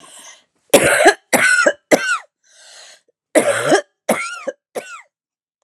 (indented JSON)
{
  "cough_length": "5.6 s",
  "cough_amplitude": 32768,
  "cough_signal_mean_std_ratio": 0.45,
  "survey_phase": "alpha (2021-03-01 to 2021-08-12)",
  "age": "45-64",
  "gender": "Female",
  "wearing_mask": "No",
  "symptom_cough_any": true,
  "symptom_shortness_of_breath": true,
  "symptom_fatigue": true,
  "symptom_fever_high_temperature": true,
  "symptom_headache": true,
  "smoker_status": "Ex-smoker",
  "respiratory_condition_asthma": false,
  "respiratory_condition_other": false,
  "recruitment_source": "Test and Trace",
  "submission_delay": "2 days",
  "covid_test_result": "Positive",
  "covid_test_method": "RT-qPCR",
  "covid_ct_value": 29.4,
  "covid_ct_gene": "ORF1ab gene"
}